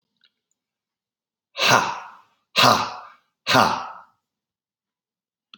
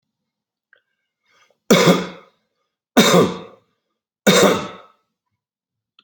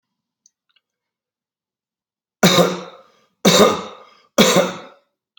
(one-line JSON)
{"exhalation_length": "5.6 s", "exhalation_amplitude": 31205, "exhalation_signal_mean_std_ratio": 0.33, "cough_length": "6.0 s", "cough_amplitude": 31101, "cough_signal_mean_std_ratio": 0.34, "three_cough_length": "5.4 s", "three_cough_amplitude": 31915, "three_cough_signal_mean_std_ratio": 0.35, "survey_phase": "alpha (2021-03-01 to 2021-08-12)", "age": "45-64", "gender": "Male", "wearing_mask": "No", "symptom_none": true, "smoker_status": "Current smoker (1 to 10 cigarettes per day)", "respiratory_condition_asthma": false, "respiratory_condition_other": false, "recruitment_source": "REACT", "submission_delay": "1 day", "covid_test_result": "Negative", "covid_test_method": "RT-qPCR"}